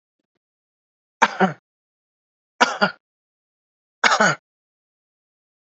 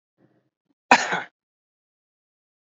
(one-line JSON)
{"three_cough_length": "5.7 s", "three_cough_amplitude": 32768, "three_cough_signal_mean_std_ratio": 0.26, "cough_length": "2.7 s", "cough_amplitude": 32767, "cough_signal_mean_std_ratio": 0.19, "survey_phase": "beta (2021-08-13 to 2022-03-07)", "age": "18-44", "gender": "Male", "wearing_mask": "No", "symptom_runny_or_blocked_nose": true, "smoker_status": "Never smoked", "respiratory_condition_asthma": false, "respiratory_condition_other": false, "recruitment_source": "Test and Trace", "submission_delay": "2 days", "covid_test_result": "Positive", "covid_test_method": "RT-qPCR", "covid_ct_value": 19.5, "covid_ct_gene": "N gene"}